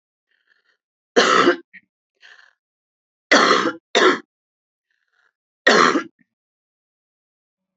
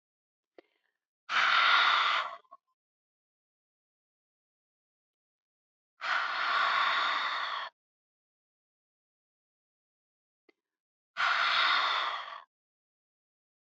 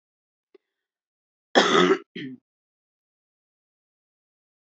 {"three_cough_length": "7.8 s", "three_cough_amplitude": 31634, "three_cough_signal_mean_std_ratio": 0.33, "exhalation_length": "13.7 s", "exhalation_amplitude": 7766, "exhalation_signal_mean_std_ratio": 0.43, "cough_length": "4.7 s", "cough_amplitude": 21748, "cough_signal_mean_std_ratio": 0.24, "survey_phase": "beta (2021-08-13 to 2022-03-07)", "age": "45-64", "gender": "Female", "wearing_mask": "No", "symptom_none": true, "smoker_status": "Current smoker (11 or more cigarettes per day)", "respiratory_condition_asthma": false, "respiratory_condition_other": false, "recruitment_source": "Test and Trace", "submission_delay": "2 days", "covid_test_result": "Positive", "covid_test_method": "RT-qPCR", "covid_ct_value": 33.0, "covid_ct_gene": "ORF1ab gene"}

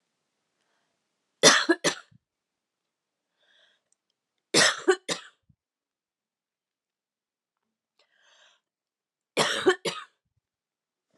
{"three_cough_length": "11.2 s", "three_cough_amplitude": 28924, "three_cough_signal_mean_std_ratio": 0.23, "survey_phase": "beta (2021-08-13 to 2022-03-07)", "age": "18-44", "gender": "Female", "wearing_mask": "No", "symptom_cough_any": true, "symptom_new_continuous_cough": true, "symptom_runny_or_blocked_nose": true, "symptom_sore_throat": true, "symptom_other": true, "symptom_onset": "4 days", "smoker_status": "Never smoked", "respiratory_condition_asthma": false, "respiratory_condition_other": false, "recruitment_source": "Test and Trace", "submission_delay": "3 days", "covid_test_result": "Positive", "covid_test_method": "RT-qPCR", "covid_ct_value": 21.9, "covid_ct_gene": "N gene", "covid_ct_mean": 21.9, "covid_viral_load": "63000 copies/ml", "covid_viral_load_category": "Low viral load (10K-1M copies/ml)"}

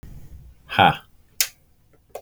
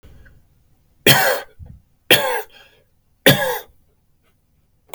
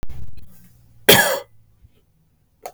{"exhalation_length": "2.2 s", "exhalation_amplitude": 32766, "exhalation_signal_mean_std_ratio": 0.29, "three_cough_length": "4.9 s", "three_cough_amplitude": 32768, "three_cough_signal_mean_std_ratio": 0.33, "cough_length": "2.7 s", "cough_amplitude": 32768, "cough_signal_mean_std_ratio": 0.4, "survey_phase": "beta (2021-08-13 to 2022-03-07)", "age": "18-44", "gender": "Male", "wearing_mask": "No", "symptom_none": true, "symptom_onset": "8 days", "smoker_status": "Prefer not to say", "respiratory_condition_asthma": false, "respiratory_condition_other": false, "recruitment_source": "REACT", "submission_delay": "0 days", "covid_test_result": "Negative", "covid_test_method": "RT-qPCR", "influenza_a_test_result": "Negative", "influenza_b_test_result": "Negative"}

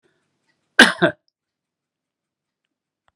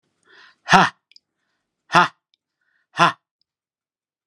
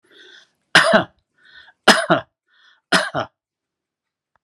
{"cough_length": "3.2 s", "cough_amplitude": 32768, "cough_signal_mean_std_ratio": 0.18, "exhalation_length": "4.3 s", "exhalation_amplitude": 32768, "exhalation_signal_mean_std_ratio": 0.23, "three_cough_length": "4.4 s", "three_cough_amplitude": 32768, "three_cough_signal_mean_std_ratio": 0.31, "survey_phase": "beta (2021-08-13 to 2022-03-07)", "age": "65+", "gender": "Male", "wearing_mask": "No", "symptom_none": true, "smoker_status": "Never smoked", "respiratory_condition_asthma": false, "respiratory_condition_other": false, "recruitment_source": "REACT", "submission_delay": "1 day", "covid_test_result": "Negative", "covid_test_method": "RT-qPCR"}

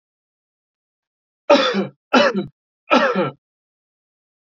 {"three_cough_length": "4.4 s", "three_cough_amplitude": 27799, "three_cough_signal_mean_std_ratio": 0.37, "survey_phase": "alpha (2021-03-01 to 2021-08-12)", "age": "18-44", "gender": "Male", "wearing_mask": "No", "symptom_none": true, "smoker_status": "Never smoked", "respiratory_condition_asthma": false, "respiratory_condition_other": false, "recruitment_source": "REACT", "submission_delay": "1 day", "covid_test_result": "Negative", "covid_test_method": "RT-qPCR"}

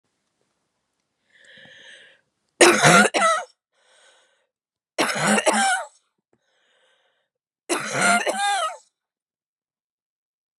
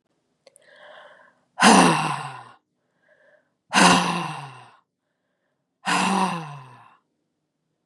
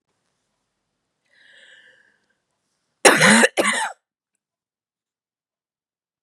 {"three_cough_length": "10.6 s", "three_cough_amplitude": 30543, "three_cough_signal_mean_std_ratio": 0.37, "exhalation_length": "7.9 s", "exhalation_amplitude": 30341, "exhalation_signal_mean_std_ratio": 0.36, "cough_length": "6.2 s", "cough_amplitude": 32768, "cough_signal_mean_std_ratio": 0.25, "survey_phase": "beta (2021-08-13 to 2022-03-07)", "age": "18-44", "gender": "Female", "wearing_mask": "No", "symptom_cough_any": true, "symptom_sore_throat": true, "symptom_fatigue": true, "symptom_headache": true, "symptom_other": true, "symptom_onset": "1 day", "smoker_status": "Never smoked", "respiratory_condition_asthma": false, "respiratory_condition_other": false, "recruitment_source": "Test and Trace", "submission_delay": "1 day", "covid_test_result": "Positive", "covid_test_method": "RT-qPCR", "covid_ct_value": 17.9, "covid_ct_gene": "ORF1ab gene", "covid_ct_mean": 18.2, "covid_viral_load": "1100000 copies/ml", "covid_viral_load_category": "High viral load (>1M copies/ml)"}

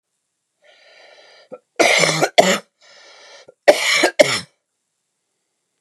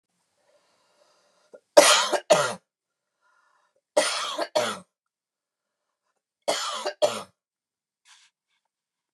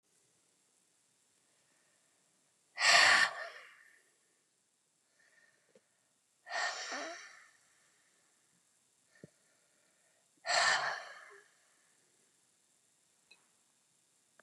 {"cough_length": "5.8 s", "cough_amplitude": 32768, "cough_signal_mean_std_ratio": 0.35, "three_cough_length": "9.1 s", "three_cough_amplitude": 32178, "three_cough_signal_mean_std_ratio": 0.29, "exhalation_length": "14.4 s", "exhalation_amplitude": 8652, "exhalation_signal_mean_std_ratio": 0.25, "survey_phase": "beta (2021-08-13 to 2022-03-07)", "age": "45-64", "gender": "Female", "wearing_mask": "No", "symptom_headache": true, "smoker_status": "Ex-smoker", "respiratory_condition_asthma": false, "respiratory_condition_other": false, "recruitment_source": "REACT", "submission_delay": "2 days", "covid_test_result": "Negative", "covid_test_method": "RT-qPCR", "influenza_a_test_result": "Negative", "influenza_b_test_result": "Negative"}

